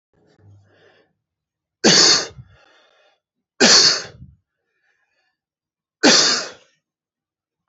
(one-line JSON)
{"three_cough_length": "7.7 s", "three_cough_amplitude": 32768, "three_cough_signal_mean_std_ratio": 0.32, "survey_phase": "alpha (2021-03-01 to 2021-08-12)", "age": "18-44", "gender": "Male", "wearing_mask": "No", "symptom_cough_any": true, "symptom_fatigue": true, "symptom_headache": true, "smoker_status": "Never smoked", "respiratory_condition_asthma": false, "respiratory_condition_other": false, "recruitment_source": "Test and Trace", "submission_delay": "37 days", "covid_test_result": "Negative", "covid_test_method": "RT-qPCR"}